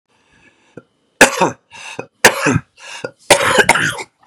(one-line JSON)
{"three_cough_length": "4.3 s", "three_cough_amplitude": 32768, "three_cough_signal_mean_std_ratio": 0.41, "survey_phase": "beta (2021-08-13 to 2022-03-07)", "age": "18-44", "gender": "Male", "wearing_mask": "No", "symptom_none": true, "smoker_status": "Ex-smoker", "respiratory_condition_asthma": false, "respiratory_condition_other": false, "recruitment_source": "REACT", "submission_delay": "4 days", "covid_test_result": "Negative", "covid_test_method": "RT-qPCR", "influenza_a_test_result": "Negative", "influenza_b_test_result": "Negative"}